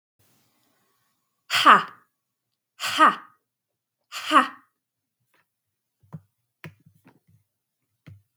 {"exhalation_length": "8.4 s", "exhalation_amplitude": 32766, "exhalation_signal_mean_std_ratio": 0.22, "survey_phase": "beta (2021-08-13 to 2022-03-07)", "age": "18-44", "gender": "Female", "wearing_mask": "No", "symptom_none": true, "smoker_status": "Ex-smoker", "respiratory_condition_asthma": false, "respiratory_condition_other": false, "recruitment_source": "REACT", "submission_delay": "1 day", "covid_test_result": "Negative", "covid_test_method": "RT-qPCR", "influenza_a_test_result": "Negative", "influenza_b_test_result": "Negative"}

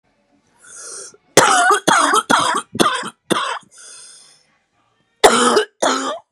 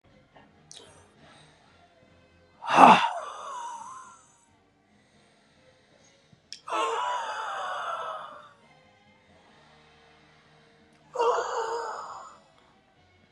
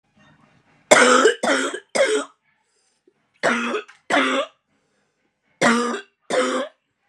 {"cough_length": "6.3 s", "cough_amplitude": 32768, "cough_signal_mean_std_ratio": 0.5, "exhalation_length": "13.3 s", "exhalation_amplitude": 32724, "exhalation_signal_mean_std_ratio": 0.3, "three_cough_length": "7.1 s", "three_cough_amplitude": 32768, "three_cough_signal_mean_std_ratio": 0.47, "survey_phase": "beta (2021-08-13 to 2022-03-07)", "age": "45-64", "gender": "Female", "wearing_mask": "No", "symptom_cough_any": true, "symptom_runny_or_blocked_nose": true, "symptom_fatigue": true, "symptom_headache": true, "symptom_onset": "2 days", "smoker_status": "Current smoker (1 to 10 cigarettes per day)", "respiratory_condition_asthma": false, "respiratory_condition_other": false, "recruitment_source": "Test and Trace", "submission_delay": "1 day", "covid_test_result": "Positive", "covid_test_method": "ePCR"}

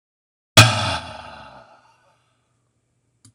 {"exhalation_length": "3.3 s", "exhalation_amplitude": 26028, "exhalation_signal_mean_std_ratio": 0.25, "survey_phase": "beta (2021-08-13 to 2022-03-07)", "age": "65+", "gender": "Male", "wearing_mask": "No", "symptom_cough_any": true, "symptom_runny_or_blocked_nose": true, "symptom_abdominal_pain": true, "symptom_fatigue": true, "symptom_headache": true, "symptom_onset": "4 days", "smoker_status": "Ex-smoker", "respiratory_condition_asthma": false, "respiratory_condition_other": false, "recruitment_source": "Test and Trace", "submission_delay": "1 day", "covid_test_result": "Positive", "covid_test_method": "RT-qPCR", "covid_ct_value": 18.2, "covid_ct_gene": "ORF1ab gene"}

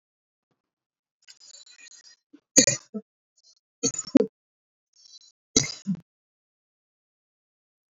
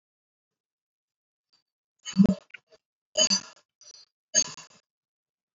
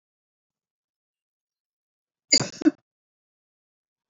{"three_cough_length": "7.9 s", "three_cough_amplitude": 27987, "three_cough_signal_mean_std_ratio": 0.19, "exhalation_length": "5.5 s", "exhalation_amplitude": 12781, "exhalation_signal_mean_std_ratio": 0.23, "cough_length": "4.1 s", "cough_amplitude": 22776, "cough_signal_mean_std_ratio": 0.16, "survey_phase": "beta (2021-08-13 to 2022-03-07)", "age": "65+", "gender": "Female", "wearing_mask": "No", "symptom_none": true, "smoker_status": "Never smoked", "respiratory_condition_asthma": false, "respiratory_condition_other": false, "recruitment_source": "REACT", "submission_delay": "1 day", "covid_test_result": "Negative", "covid_test_method": "RT-qPCR", "influenza_a_test_result": "Unknown/Void", "influenza_b_test_result": "Unknown/Void"}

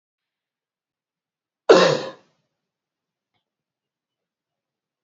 {"cough_length": "5.0 s", "cough_amplitude": 26762, "cough_signal_mean_std_ratio": 0.19, "survey_phase": "alpha (2021-03-01 to 2021-08-12)", "age": "45-64", "gender": "Male", "wearing_mask": "No", "symptom_none": true, "smoker_status": "Never smoked", "respiratory_condition_asthma": false, "respiratory_condition_other": false, "recruitment_source": "REACT", "submission_delay": "2 days", "covid_test_result": "Negative", "covid_test_method": "RT-qPCR"}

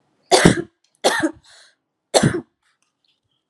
{"three_cough_length": "3.5 s", "three_cough_amplitude": 32768, "three_cough_signal_mean_std_ratio": 0.34, "survey_phase": "alpha (2021-03-01 to 2021-08-12)", "age": "18-44", "gender": "Female", "wearing_mask": "No", "symptom_none": true, "smoker_status": "Never smoked", "respiratory_condition_asthma": true, "respiratory_condition_other": false, "recruitment_source": "Test and Trace", "submission_delay": "0 days", "covid_test_result": "Negative", "covid_test_method": "LFT"}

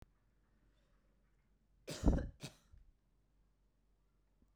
{"cough_length": "4.6 s", "cough_amplitude": 4258, "cough_signal_mean_std_ratio": 0.21, "survey_phase": "beta (2021-08-13 to 2022-03-07)", "age": "45-64", "gender": "Female", "wearing_mask": "No", "symptom_none": true, "smoker_status": "Ex-smoker", "respiratory_condition_asthma": false, "respiratory_condition_other": false, "recruitment_source": "REACT", "submission_delay": "2 days", "covid_test_result": "Negative", "covid_test_method": "RT-qPCR"}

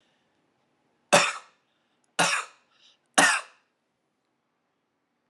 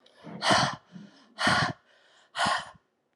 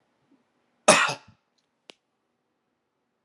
{"three_cough_length": "5.3 s", "three_cough_amplitude": 31500, "three_cough_signal_mean_std_ratio": 0.27, "exhalation_length": "3.2 s", "exhalation_amplitude": 12381, "exhalation_signal_mean_std_ratio": 0.47, "cough_length": "3.2 s", "cough_amplitude": 31045, "cough_signal_mean_std_ratio": 0.2, "survey_phase": "alpha (2021-03-01 to 2021-08-12)", "age": "45-64", "gender": "Male", "wearing_mask": "Yes", "symptom_none": true, "smoker_status": "Never smoked", "respiratory_condition_asthma": false, "respiratory_condition_other": false, "recruitment_source": "Test and Trace", "submission_delay": "0 days", "covid_test_result": "Negative", "covid_test_method": "LFT"}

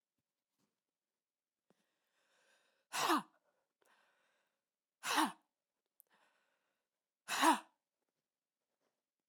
{"exhalation_length": "9.3 s", "exhalation_amplitude": 3832, "exhalation_signal_mean_std_ratio": 0.22, "survey_phase": "beta (2021-08-13 to 2022-03-07)", "age": "18-44", "gender": "Female", "wearing_mask": "No", "symptom_cough_any": true, "symptom_runny_or_blocked_nose": true, "symptom_onset": "3 days", "smoker_status": "Never smoked", "respiratory_condition_asthma": false, "respiratory_condition_other": false, "recruitment_source": "Test and Trace", "submission_delay": "1 day", "covid_test_result": "Positive", "covid_test_method": "RT-qPCR", "covid_ct_value": 18.1, "covid_ct_gene": "ORF1ab gene", "covid_ct_mean": 18.5, "covid_viral_load": "840000 copies/ml", "covid_viral_load_category": "Low viral load (10K-1M copies/ml)"}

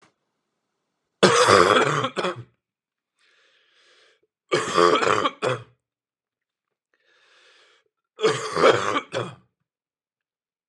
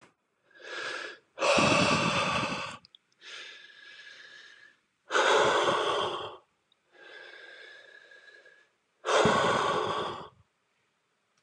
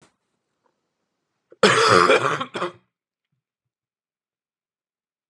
{"three_cough_length": "10.7 s", "three_cough_amplitude": 30599, "three_cough_signal_mean_std_ratio": 0.37, "exhalation_length": "11.4 s", "exhalation_amplitude": 9741, "exhalation_signal_mean_std_ratio": 0.51, "cough_length": "5.3 s", "cough_amplitude": 29941, "cough_signal_mean_std_ratio": 0.3, "survey_phase": "beta (2021-08-13 to 2022-03-07)", "age": "18-44", "gender": "Male", "wearing_mask": "No", "symptom_cough_any": true, "symptom_sore_throat": true, "symptom_fatigue": true, "symptom_headache": true, "smoker_status": "Never smoked", "respiratory_condition_asthma": false, "respiratory_condition_other": false, "recruitment_source": "Test and Trace", "submission_delay": "0 days", "covid_test_result": "Positive", "covid_test_method": "LFT"}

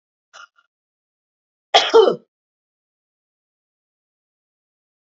{"cough_length": "5.0 s", "cough_amplitude": 28828, "cough_signal_mean_std_ratio": 0.2, "survey_phase": "beta (2021-08-13 to 2022-03-07)", "age": "65+", "gender": "Female", "wearing_mask": "No", "symptom_none": true, "smoker_status": "Never smoked", "respiratory_condition_asthma": true, "respiratory_condition_other": false, "recruitment_source": "REACT", "submission_delay": "1 day", "covid_test_result": "Negative", "covid_test_method": "RT-qPCR", "influenza_a_test_result": "Negative", "influenza_b_test_result": "Negative"}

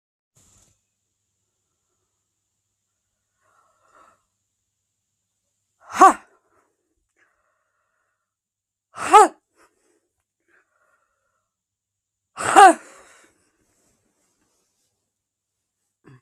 {"exhalation_length": "16.2 s", "exhalation_amplitude": 32766, "exhalation_signal_mean_std_ratio": 0.15, "survey_phase": "beta (2021-08-13 to 2022-03-07)", "age": "45-64", "gender": "Female", "wearing_mask": "No", "symptom_none": true, "smoker_status": "Current smoker (1 to 10 cigarettes per day)", "respiratory_condition_asthma": false, "respiratory_condition_other": false, "recruitment_source": "REACT", "submission_delay": "0 days", "covid_test_result": "Negative", "covid_test_method": "RT-qPCR", "influenza_a_test_result": "Negative", "influenza_b_test_result": "Negative"}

